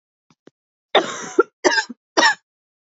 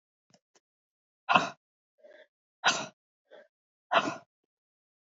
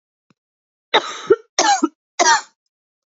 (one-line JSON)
{"cough_length": "2.8 s", "cough_amplitude": 31806, "cough_signal_mean_std_ratio": 0.35, "exhalation_length": "5.1 s", "exhalation_amplitude": 15667, "exhalation_signal_mean_std_ratio": 0.24, "three_cough_length": "3.1 s", "three_cough_amplitude": 29547, "three_cough_signal_mean_std_ratio": 0.37, "survey_phase": "beta (2021-08-13 to 2022-03-07)", "age": "18-44", "gender": "Female", "wearing_mask": "No", "symptom_cough_any": true, "symptom_runny_or_blocked_nose": true, "symptom_shortness_of_breath": true, "symptom_sore_throat": true, "symptom_abdominal_pain": true, "symptom_fever_high_temperature": true, "symptom_headache": true, "symptom_onset": "3 days", "smoker_status": "Never smoked", "respiratory_condition_asthma": true, "respiratory_condition_other": false, "recruitment_source": "Test and Trace", "submission_delay": "2 days", "covid_test_result": "Positive", "covid_test_method": "RT-qPCR", "covid_ct_value": 19.6, "covid_ct_gene": "ORF1ab gene"}